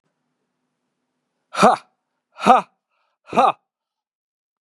{"exhalation_length": "4.6 s", "exhalation_amplitude": 32768, "exhalation_signal_mean_std_ratio": 0.25, "survey_phase": "beta (2021-08-13 to 2022-03-07)", "age": "45-64", "gender": "Male", "wearing_mask": "No", "symptom_cough_any": true, "symptom_runny_or_blocked_nose": true, "symptom_headache": true, "symptom_change_to_sense_of_smell_or_taste": true, "symptom_loss_of_taste": true, "symptom_onset": "3 days", "smoker_status": "Never smoked", "respiratory_condition_asthma": false, "respiratory_condition_other": false, "recruitment_source": "Test and Trace", "submission_delay": "1 day", "covid_test_result": "Positive", "covid_test_method": "RT-qPCR"}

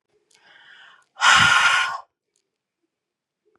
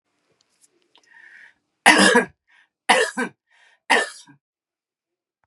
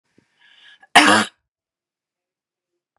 {"exhalation_length": "3.6 s", "exhalation_amplitude": 25113, "exhalation_signal_mean_std_ratio": 0.37, "three_cough_length": "5.5 s", "three_cough_amplitude": 32768, "three_cough_signal_mean_std_ratio": 0.3, "cough_length": "3.0 s", "cough_amplitude": 32768, "cough_signal_mean_std_ratio": 0.24, "survey_phase": "beta (2021-08-13 to 2022-03-07)", "age": "65+", "gender": "Female", "wearing_mask": "No", "symptom_cough_any": true, "symptom_fatigue": true, "symptom_other": true, "smoker_status": "Ex-smoker", "respiratory_condition_asthma": false, "respiratory_condition_other": false, "recruitment_source": "Test and Trace", "submission_delay": "1 day", "covid_test_result": "Positive", "covid_test_method": "RT-qPCR", "covid_ct_value": 27.4, "covid_ct_gene": "ORF1ab gene"}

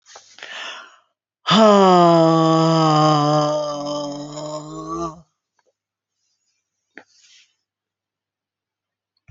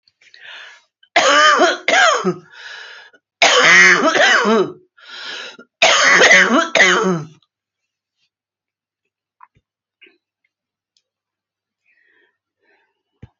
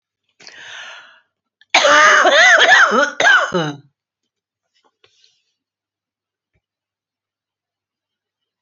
{"exhalation_length": "9.3 s", "exhalation_amplitude": 29408, "exhalation_signal_mean_std_ratio": 0.46, "three_cough_length": "13.4 s", "three_cough_amplitude": 32768, "three_cough_signal_mean_std_ratio": 0.45, "cough_length": "8.6 s", "cough_amplitude": 32208, "cough_signal_mean_std_ratio": 0.39, "survey_phase": "beta (2021-08-13 to 2022-03-07)", "age": "45-64", "gender": "Female", "wearing_mask": "No", "symptom_none": true, "smoker_status": "Ex-smoker", "respiratory_condition_asthma": false, "respiratory_condition_other": true, "recruitment_source": "REACT", "submission_delay": "3 days", "covid_test_result": "Negative", "covid_test_method": "RT-qPCR"}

